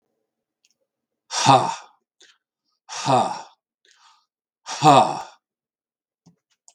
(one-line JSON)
{"exhalation_length": "6.7 s", "exhalation_amplitude": 32768, "exhalation_signal_mean_std_ratio": 0.3, "survey_phase": "beta (2021-08-13 to 2022-03-07)", "age": "65+", "gender": "Male", "wearing_mask": "No", "symptom_cough_any": true, "symptom_onset": "3 days", "smoker_status": "Ex-smoker", "respiratory_condition_asthma": false, "respiratory_condition_other": false, "recruitment_source": "Test and Trace", "submission_delay": "2 days", "covid_test_result": "Positive", "covid_test_method": "RT-qPCR", "covid_ct_value": 16.2, "covid_ct_gene": "ORF1ab gene"}